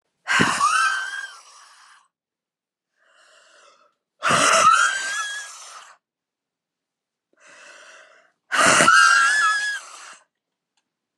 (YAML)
exhalation_length: 11.2 s
exhalation_amplitude: 29427
exhalation_signal_mean_std_ratio: 0.45
survey_phase: alpha (2021-03-01 to 2021-08-12)
age: 18-44
gender: Female
wearing_mask: 'No'
symptom_new_continuous_cough: true
symptom_shortness_of_breath: true
symptom_fatigue: true
symptom_onset: 3 days
smoker_status: Never smoked
respiratory_condition_asthma: false
respiratory_condition_other: false
recruitment_source: Test and Trace
submission_delay: 2 days
covid_test_result: Positive
covid_test_method: RT-qPCR
covid_ct_value: 24.4
covid_ct_gene: ORF1ab gene
covid_ct_mean: 25.2
covid_viral_load: 5400 copies/ml
covid_viral_load_category: Minimal viral load (< 10K copies/ml)